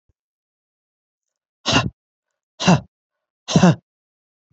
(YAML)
exhalation_length: 4.5 s
exhalation_amplitude: 25980
exhalation_signal_mean_std_ratio: 0.28
survey_phase: beta (2021-08-13 to 2022-03-07)
age: 45-64
gender: Male
wearing_mask: 'No'
symptom_none: true
smoker_status: Never smoked
respiratory_condition_asthma: true
respiratory_condition_other: false
recruitment_source: REACT
submission_delay: 1 day
covid_test_result: Negative
covid_test_method: RT-qPCR